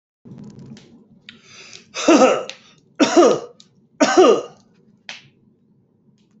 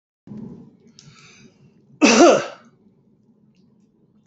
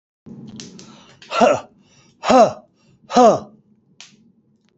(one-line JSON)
{"three_cough_length": "6.4 s", "three_cough_amplitude": 28001, "three_cough_signal_mean_std_ratio": 0.36, "cough_length": "4.3 s", "cough_amplitude": 28761, "cough_signal_mean_std_ratio": 0.28, "exhalation_length": "4.8 s", "exhalation_amplitude": 28876, "exhalation_signal_mean_std_ratio": 0.34, "survey_phase": "beta (2021-08-13 to 2022-03-07)", "age": "65+", "gender": "Male", "wearing_mask": "No", "symptom_runny_or_blocked_nose": true, "symptom_sore_throat": true, "symptom_headache": true, "symptom_onset": "12 days", "smoker_status": "Ex-smoker", "respiratory_condition_asthma": false, "respiratory_condition_other": false, "recruitment_source": "REACT", "submission_delay": "1 day", "covid_test_result": "Negative", "covid_test_method": "RT-qPCR", "influenza_a_test_result": "Negative", "influenza_b_test_result": "Negative"}